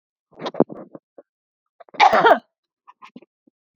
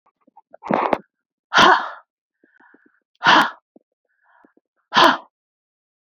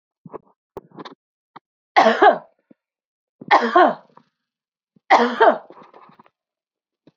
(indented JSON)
{
  "cough_length": "3.8 s",
  "cough_amplitude": 28598,
  "cough_signal_mean_std_ratio": 0.28,
  "exhalation_length": "6.1 s",
  "exhalation_amplitude": 29122,
  "exhalation_signal_mean_std_ratio": 0.31,
  "three_cough_length": "7.2 s",
  "three_cough_amplitude": 32767,
  "three_cough_signal_mean_std_ratio": 0.31,
  "survey_phase": "beta (2021-08-13 to 2022-03-07)",
  "age": "45-64",
  "gender": "Female",
  "wearing_mask": "No",
  "symptom_none": true,
  "smoker_status": "Never smoked",
  "respiratory_condition_asthma": false,
  "respiratory_condition_other": false,
  "recruitment_source": "REACT",
  "submission_delay": "1 day",
  "covid_test_result": "Negative",
  "covid_test_method": "RT-qPCR",
  "influenza_a_test_result": "Unknown/Void",
  "influenza_b_test_result": "Unknown/Void"
}